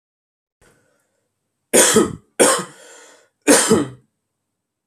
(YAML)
three_cough_length: 4.9 s
three_cough_amplitude: 32768
three_cough_signal_mean_std_ratio: 0.36
survey_phase: alpha (2021-03-01 to 2021-08-12)
age: 18-44
gender: Male
wearing_mask: 'No'
symptom_none: true
smoker_status: Ex-smoker
respiratory_condition_asthma: false
respiratory_condition_other: false
recruitment_source: REACT
submission_delay: 1 day
covid_test_result: Negative
covid_test_method: RT-qPCR